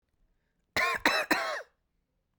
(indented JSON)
{
  "cough_length": "2.4 s",
  "cough_amplitude": 12915,
  "cough_signal_mean_std_ratio": 0.44,
  "survey_phase": "beta (2021-08-13 to 2022-03-07)",
  "age": "45-64",
  "gender": "Female",
  "wearing_mask": "No",
  "symptom_shortness_of_breath": true,
  "symptom_onset": "9 days",
  "smoker_status": "Never smoked",
  "respiratory_condition_asthma": false,
  "respiratory_condition_other": false,
  "recruitment_source": "REACT",
  "submission_delay": "2 days",
  "covid_test_result": "Negative",
  "covid_test_method": "RT-qPCR",
  "influenza_a_test_result": "Negative",
  "influenza_b_test_result": "Negative"
}